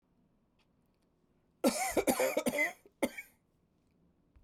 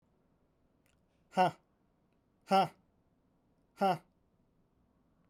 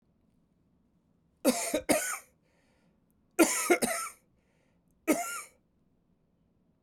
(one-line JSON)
{"cough_length": "4.4 s", "cough_amplitude": 6270, "cough_signal_mean_std_ratio": 0.38, "exhalation_length": "5.3 s", "exhalation_amplitude": 4971, "exhalation_signal_mean_std_ratio": 0.25, "three_cough_length": "6.8 s", "three_cough_amplitude": 11520, "three_cough_signal_mean_std_ratio": 0.34, "survey_phase": "beta (2021-08-13 to 2022-03-07)", "age": "45-64", "gender": "Male", "wearing_mask": "No", "symptom_cough_any": true, "symptom_fever_high_temperature": true, "smoker_status": "Never smoked", "respiratory_condition_asthma": false, "respiratory_condition_other": false, "recruitment_source": "Test and Trace", "submission_delay": "1 day", "covid_test_result": "Positive", "covid_test_method": "RT-qPCR", "covid_ct_value": 18.4, "covid_ct_gene": "ORF1ab gene", "covid_ct_mean": 20.0, "covid_viral_load": "270000 copies/ml", "covid_viral_load_category": "Low viral load (10K-1M copies/ml)"}